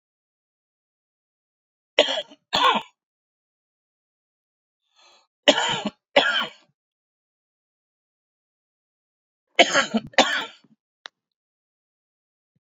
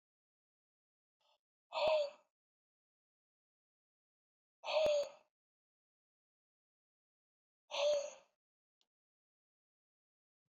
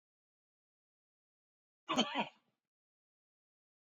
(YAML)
three_cough_length: 12.6 s
three_cough_amplitude: 31294
three_cough_signal_mean_std_ratio: 0.26
exhalation_length: 10.5 s
exhalation_amplitude: 2185
exhalation_signal_mean_std_ratio: 0.28
cough_length: 3.9 s
cough_amplitude: 4165
cough_signal_mean_std_ratio: 0.21
survey_phase: beta (2021-08-13 to 2022-03-07)
age: 45-64
gender: Male
wearing_mask: 'No'
symptom_none: true
smoker_status: Current smoker (1 to 10 cigarettes per day)
respiratory_condition_asthma: false
respiratory_condition_other: false
recruitment_source: REACT
submission_delay: 1 day
covid_test_result: Negative
covid_test_method: RT-qPCR